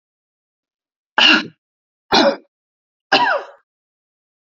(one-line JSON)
{"three_cough_length": "4.5 s", "three_cough_amplitude": 30812, "three_cough_signal_mean_std_ratio": 0.33, "survey_phase": "beta (2021-08-13 to 2022-03-07)", "age": "65+", "gender": "Female", "wearing_mask": "No", "symptom_none": true, "smoker_status": "Never smoked", "respiratory_condition_asthma": false, "respiratory_condition_other": false, "recruitment_source": "REACT", "submission_delay": "1 day", "covid_test_result": "Negative", "covid_test_method": "RT-qPCR", "influenza_a_test_result": "Negative", "influenza_b_test_result": "Negative"}